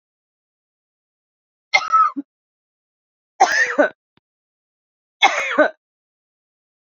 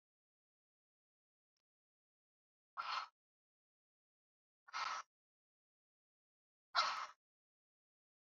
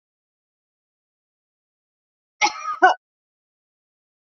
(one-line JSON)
{"three_cough_length": "6.8 s", "three_cough_amplitude": 29577, "three_cough_signal_mean_std_ratio": 0.32, "exhalation_length": "8.3 s", "exhalation_amplitude": 2572, "exhalation_signal_mean_std_ratio": 0.23, "cough_length": "4.4 s", "cough_amplitude": 28116, "cough_signal_mean_std_ratio": 0.19, "survey_phase": "beta (2021-08-13 to 2022-03-07)", "age": "45-64", "gender": "Female", "wearing_mask": "No", "symptom_none": true, "smoker_status": "Ex-smoker", "respiratory_condition_asthma": false, "respiratory_condition_other": false, "recruitment_source": "REACT", "submission_delay": "2 days", "covid_test_result": "Negative", "covid_test_method": "RT-qPCR", "influenza_a_test_result": "Unknown/Void", "influenza_b_test_result": "Unknown/Void"}